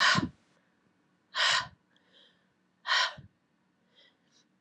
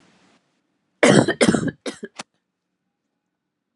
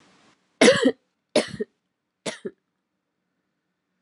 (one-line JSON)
{"exhalation_length": "4.6 s", "exhalation_amplitude": 8243, "exhalation_signal_mean_std_ratio": 0.34, "cough_length": "3.8 s", "cough_amplitude": 31714, "cough_signal_mean_std_ratio": 0.3, "three_cough_length": "4.0 s", "three_cough_amplitude": 26857, "three_cough_signal_mean_std_ratio": 0.26, "survey_phase": "alpha (2021-03-01 to 2021-08-12)", "age": "18-44", "gender": "Female", "wearing_mask": "No", "symptom_new_continuous_cough": true, "symptom_shortness_of_breath": true, "symptom_fatigue": true, "symptom_fever_high_temperature": true, "symptom_change_to_sense_of_smell_or_taste": true, "symptom_loss_of_taste": true, "smoker_status": "Never smoked", "respiratory_condition_asthma": true, "respiratory_condition_other": false, "recruitment_source": "Test and Trace", "submission_delay": "2 days", "covid_test_result": "Positive", "covid_test_method": "RT-qPCR", "covid_ct_value": 26.0, "covid_ct_gene": "ORF1ab gene", "covid_ct_mean": 26.5, "covid_viral_load": "2000 copies/ml", "covid_viral_load_category": "Minimal viral load (< 10K copies/ml)"}